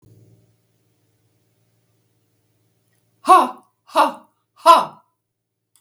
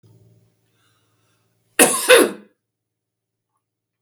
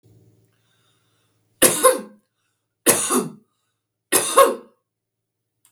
{"exhalation_length": "5.8 s", "exhalation_amplitude": 32766, "exhalation_signal_mean_std_ratio": 0.23, "cough_length": "4.0 s", "cough_amplitude": 32766, "cough_signal_mean_std_ratio": 0.25, "three_cough_length": "5.7 s", "three_cough_amplitude": 32768, "three_cough_signal_mean_std_ratio": 0.32, "survey_phase": "beta (2021-08-13 to 2022-03-07)", "age": "65+", "gender": "Female", "wearing_mask": "No", "symptom_none": true, "smoker_status": "Ex-smoker", "respiratory_condition_asthma": false, "respiratory_condition_other": false, "recruitment_source": "REACT", "submission_delay": "3 days", "covid_test_result": "Negative", "covid_test_method": "RT-qPCR"}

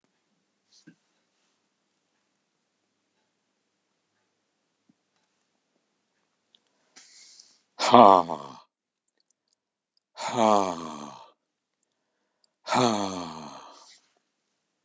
{"exhalation_length": "14.8 s", "exhalation_amplitude": 32765, "exhalation_signal_mean_std_ratio": 0.2, "survey_phase": "alpha (2021-03-01 to 2021-08-12)", "age": "65+", "gender": "Male", "wearing_mask": "No", "symptom_none": true, "smoker_status": "Never smoked", "respiratory_condition_asthma": false, "respiratory_condition_other": true, "recruitment_source": "Test and Trace", "submission_delay": "2 days", "covid_test_result": "Positive", "covid_test_method": "RT-qPCR", "covid_ct_value": 34.1, "covid_ct_gene": "ORF1ab gene"}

